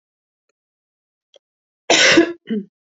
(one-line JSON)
{"cough_length": "2.9 s", "cough_amplitude": 31537, "cough_signal_mean_std_ratio": 0.33, "survey_phase": "beta (2021-08-13 to 2022-03-07)", "age": "45-64", "gender": "Female", "wearing_mask": "No", "symptom_cough_any": true, "symptom_runny_or_blocked_nose": true, "symptom_sore_throat": true, "symptom_abdominal_pain": true, "symptom_diarrhoea": true, "symptom_fatigue": true, "symptom_fever_high_temperature": true, "symptom_headache": true, "symptom_other": true, "smoker_status": "Never smoked", "respiratory_condition_asthma": false, "respiratory_condition_other": false, "recruitment_source": "Test and Trace", "submission_delay": "1 day", "covid_test_result": "Positive", "covid_test_method": "RT-qPCR", "covid_ct_value": 22.4, "covid_ct_gene": "N gene"}